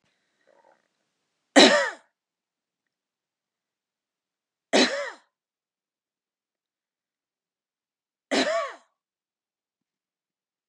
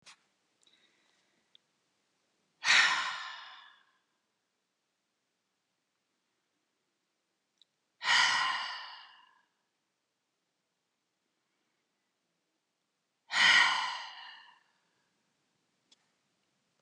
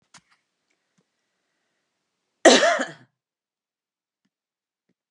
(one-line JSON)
{"three_cough_length": "10.7 s", "three_cough_amplitude": 27334, "three_cough_signal_mean_std_ratio": 0.21, "exhalation_length": "16.8 s", "exhalation_amplitude": 8735, "exhalation_signal_mean_std_ratio": 0.26, "cough_length": "5.1 s", "cough_amplitude": 31561, "cough_signal_mean_std_ratio": 0.2, "survey_phase": "beta (2021-08-13 to 2022-03-07)", "age": "65+", "gender": "Female", "wearing_mask": "No", "symptom_none": true, "smoker_status": "Never smoked", "respiratory_condition_asthma": false, "respiratory_condition_other": false, "recruitment_source": "REACT", "submission_delay": "1 day", "covid_test_result": "Negative", "covid_test_method": "RT-qPCR", "influenza_a_test_result": "Negative", "influenza_b_test_result": "Negative"}